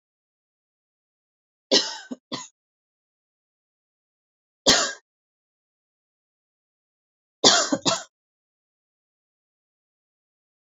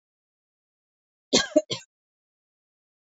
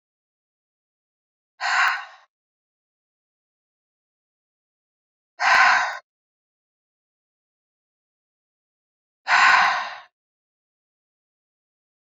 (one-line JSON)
{"three_cough_length": "10.7 s", "three_cough_amplitude": 31285, "three_cough_signal_mean_std_ratio": 0.21, "cough_length": "3.2 s", "cough_amplitude": 18663, "cough_signal_mean_std_ratio": 0.19, "exhalation_length": "12.1 s", "exhalation_amplitude": 20921, "exhalation_signal_mean_std_ratio": 0.28, "survey_phase": "beta (2021-08-13 to 2022-03-07)", "age": "18-44", "gender": "Female", "wearing_mask": "No", "symptom_fatigue": true, "symptom_fever_high_temperature": true, "symptom_headache": true, "symptom_other": true, "symptom_onset": "2 days", "smoker_status": "Ex-smoker", "respiratory_condition_asthma": false, "respiratory_condition_other": false, "recruitment_source": "Test and Trace", "submission_delay": "1 day", "covid_test_result": "Positive", "covid_test_method": "RT-qPCR", "covid_ct_value": 24.4, "covid_ct_gene": "N gene"}